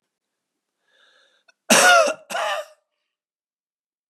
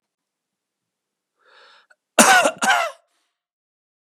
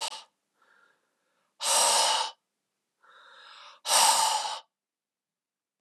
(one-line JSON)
{"three_cough_length": "4.1 s", "three_cough_amplitude": 31681, "three_cough_signal_mean_std_ratio": 0.31, "cough_length": "4.2 s", "cough_amplitude": 32768, "cough_signal_mean_std_ratio": 0.29, "exhalation_length": "5.8 s", "exhalation_amplitude": 11534, "exhalation_signal_mean_std_ratio": 0.41, "survey_phase": "beta (2021-08-13 to 2022-03-07)", "age": "45-64", "gender": "Male", "wearing_mask": "No", "symptom_cough_any": true, "symptom_runny_or_blocked_nose": true, "symptom_fatigue": true, "symptom_onset": "6 days", "smoker_status": "Never smoked", "respiratory_condition_asthma": false, "respiratory_condition_other": true, "recruitment_source": "Test and Trace", "submission_delay": "1 day", "covid_test_result": "Negative", "covid_test_method": "RT-qPCR"}